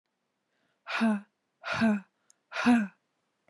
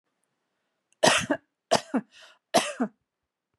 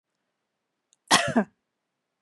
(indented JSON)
{
  "exhalation_length": "3.5 s",
  "exhalation_amplitude": 7710,
  "exhalation_signal_mean_std_ratio": 0.44,
  "three_cough_length": "3.6 s",
  "three_cough_amplitude": 21195,
  "three_cough_signal_mean_std_ratio": 0.32,
  "cough_length": "2.2 s",
  "cough_amplitude": 21254,
  "cough_signal_mean_std_ratio": 0.26,
  "survey_phase": "beta (2021-08-13 to 2022-03-07)",
  "age": "45-64",
  "gender": "Female",
  "wearing_mask": "No",
  "symptom_none": true,
  "smoker_status": "Never smoked",
  "respiratory_condition_asthma": false,
  "respiratory_condition_other": false,
  "recruitment_source": "REACT",
  "submission_delay": "1 day",
  "covid_test_result": "Negative",
  "covid_test_method": "RT-qPCR",
  "influenza_a_test_result": "Negative",
  "influenza_b_test_result": "Negative"
}